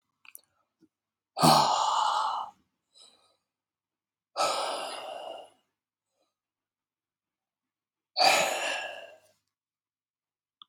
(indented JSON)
{
  "exhalation_length": "10.7 s",
  "exhalation_amplitude": 14029,
  "exhalation_signal_mean_std_ratio": 0.37,
  "survey_phase": "beta (2021-08-13 to 2022-03-07)",
  "age": "45-64",
  "gender": "Male",
  "wearing_mask": "No",
  "symptom_cough_any": true,
  "symptom_runny_or_blocked_nose": true,
  "symptom_shortness_of_breath": true,
  "symptom_sore_throat": true,
  "symptom_abdominal_pain": true,
  "symptom_fatigue": true,
  "symptom_fever_high_temperature": true,
  "symptom_headache": true,
  "symptom_change_to_sense_of_smell_or_taste": true,
  "symptom_loss_of_taste": true,
  "symptom_onset": "3 days",
  "smoker_status": "Ex-smoker",
  "respiratory_condition_asthma": false,
  "respiratory_condition_other": false,
  "recruitment_source": "Test and Trace",
  "submission_delay": "2 days",
  "covid_test_result": "Positive",
  "covid_test_method": "RT-qPCR",
  "covid_ct_value": 18.0,
  "covid_ct_gene": "ORF1ab gene",
  "covid_ct_mean": 19.3,
  "covid_viral_load": "480000 copies/ml",
  "covid_viral_load_category": "Low viral load (10K-1M copies/ml)"
}